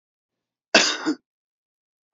{"cough_length": "2.1 s", "cough_amplitude": 31486, "cough_signal_mean_std_ratio": 0.28, "survey_phase": "beta (2021-08-13 to 2022-03-07)", "age": "65+", "gender": "Male", "wearing_mask": "No", "symptom_none": true, "smoker_status": "Never smoked", "respiratory_condition_asthma": false, "respiratory_condition_other": false, "recruitment_source": "REACT", "submission_delay": "2 days", "covid_test_result": "Negative", "covid_test_method": "RT-qPCR", "influenza_a_test_result": "Negative", "influenza_b_test_result": "Negative"}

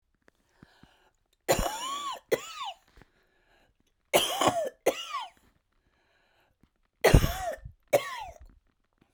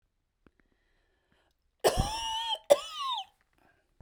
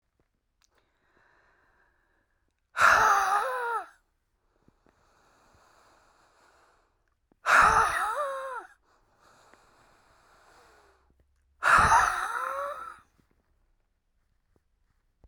{"three_cough_length": "9.1 s", "three_cough_amplitude": 21566, "three_cough_signal_mean_std_ratio": 0.34, "cough_length": "4.0 s", "cough_amplitude": 16837, "cough_signal_mean_std_ratio": 0.34, "exhalation_length": "15.3 s", "exhalation_amplitude": 14155, "exhalation_signal_mean_std_ratio": 0.34, "survey_phase": "beta (2021-08-13 to 2022-03-07)", "age": "45-64", "gender": "Female", "wearing_mask": "No", "symptom_cough_any": true, "symptom_runny_or_blocked_nose": true, "symptom_shortness_of_breath": true, "symptom_fatigue": true, "symptom_headache": true, "symptom_loss_of_taste": true, "smoker_status": "Ex-smoker", "respiratory_condition_asthma": true, "respiratory_condition_other": false, "recruitment_source": "REACT", "submission_delay": "1 day", "covid_test_result": "Negative", "covid_test_method": "RT-qPCR"}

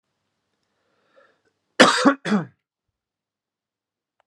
{"cough_length": "4.3 s", "cough_amplitude": 32767, "cough_signal_mean_std_ratio": 0.24, "survey_phase": "beta (2021-08-13 to 2022-03-07)", "age": "18-44", "gender": "Male", "wearing_mask": "No", "symptom_none": true, "smoker_status": "Never smoked", "respiratory_condition_asthma": false, "respiratory_condition_other": false, "recruitment_source": "REACT", "submission_delay": "1 day", "covid_test_result": "Negative", "covid_test_method": "RT-qPCR", "influenza_a_test_result": "Negative", "influenza_b_test_result": "Negative"}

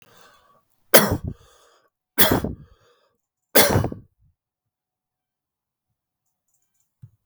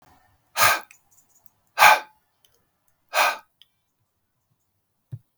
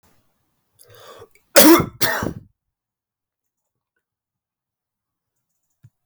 {"three_cough_length": "7.3 s", "three_cough_amplitude": 32768, "three_cough_signal_mean_std_ratio": 0.25, "exhalation_length": "5.4 s", "exhalation_amplitude": 32768, "exhalation_signal_mean_std_ratio": 0.26, "cough_length": "6.1 s", "cough_amplitude": 32768, "cough_signal_mean_std_ratio": 0.23, "survey_phase": "beta (2021-08-13 to 2022-03-07)", "age": "45-64", "gender": "Male", "wearing_mask": "No", "symptom_cough_any": true, "symptom_headache": true, "smoker_status": "Never smoked", "respiratory_condition_asthma": false, "respiratory_condition_other": false, "recruitment_source": "Test and Trace", "submission_delay": "1 day", "covid_test_result": "Positive", "covid_test_method": "ePCR"}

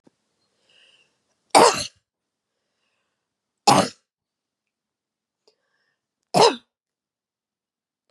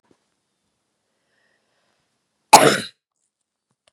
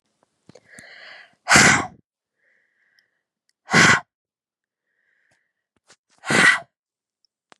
{"three_cough_length": "8.1 s", "three_cough_amplitude": 31272, "three_cough_signal_mean_std_ratio": 0.21, "cough_length": "3.9 s", "cough_amplitude": 32768, "cough_signal_mean_std_ratio": 0.18, "exhalation_length": "7.6 s", "exhalation_amplitude": 31171, "exhalation_signal_mean_std_ratio": 0.28, "survey_phase": "beta (2021-08-13 to 2022-03-07)", "age": "18-44", "gender": "Female", "wearing_mask": "No", "symptom_runny_or_blocked_nose": true, "symptom_fatigue": true, "symptom_onset": "13 days", "smoker_status": "Never smoked", "respiratory_condition_asthma": true, "respiratory_condition_other": false, "recruitment_source": "REACT", "submission_delay": "1 day", "covid_test_result": "Negative", "covid_test_method": "RT-qPCR", "influenza_a_test_result": "Negative", "influenza_b_test_result": "Negative"}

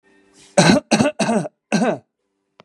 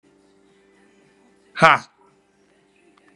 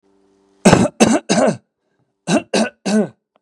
{"cough_length": "2.6 s", "cough_amplitude": 32471, "cough_signal_mean_std_ratio": 0.48, "exhalation_length": "3.2 s", "exhalation_amplitude": 32767, "exhalation_signal_mean_std_ratio": 0.19, "three_cough_length": "3.4 s", "three_cough_amplitude": 32768, "three_cough_signal_mean_std_ratio": 0.46, "survey_phase": "beta (2021-08-13 to 2022-03-07)", "age": "45-64", "gender": "Male", "wearing_mask": "No", "symptom_none": true, "smoker_status": "Current smoker (1 to 10 cigarettes per day)", "respiratory_condition_asthma": false, "respiratory_condition_other": false, "recruitment_source": "REACT", "submission_delay": "3 days", "covid_test_result": "Negative", "covid_test_method": "RT-qPCR", "influenza_a_test_result": "Negative", "influenza_b_test_result": "Negative"}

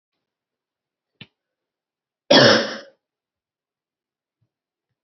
{"cough_length": "5.0 s", "cough_amplitude": 29943, "cough_signal_mean_std_ratio": 0.22, "survey_phase": "beta (2021-08-13 to 2022-03-07)", "age": "18-44", "gender": "Female", "wearing_mask": "No", "symptom_cough_any": true, "symptom_runny_or_blocked_nose": true, "symptom_fatigue": true, "symptom_headache": true, "symptom_onset": "5 days", "smoker_status": "Never smoked", "respiratory_condition_asthma": false, "respiratory_condition_other": false, "recruitment_source": "Test and Trace", "submission_delay": "2 days", "covid_test_result": "Positive", "covid_test_method": "RT-qPCR", "covid_ct_value": 16.5, "covid_ct_gene": "ORF1ab gene", "covid_ct_mean": 16.8, "covid_viral_load": "3100000 copies/ml", "covid_viral_load_category": "High viral load (>1M copies/ml)"}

